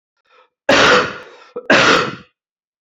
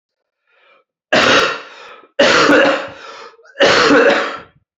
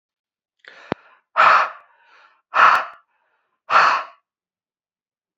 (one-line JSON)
{"cough_length": "2.8 s", "cough_amplitude": 32767, "cough_signal_mean_std_ratio": 0.47, "three_cough_length": "4.8 s", "three_cough_amplitude": 30431, "three_cough_signal_mean_std_ratio": 0.56, "exhalation_length": "5.4 s", "exhalation_amplitude": 31545, "exhalation_signal_mean_std_ratio": 0.34, "survey_phase": "beta (2021-08-13 to 2022-03-07)", "age": "45-64", "gender": "Male", "wearing_mask": "No", "symptom_cough_any": true, "symptom_runny_or_blocked_nose": true, "symptom_shortness_of_breath": true, "symptom_sore_throat": true, "symptom_fatigue": true, "symptom_fever_high_temperature": true, "symptom_change_to_sense_of_smell_or_taste": true, "symptom_onset": "4 days", "smoker_status": "Never smoked", "respiratory_condition_asthma": false, "respiratory_condition_other": false, "recruitment_source": "Test and Trace", "submission_delay": "3 days", "covid_test_result": "Positive", "covid_test_method": "RT-qPCR"}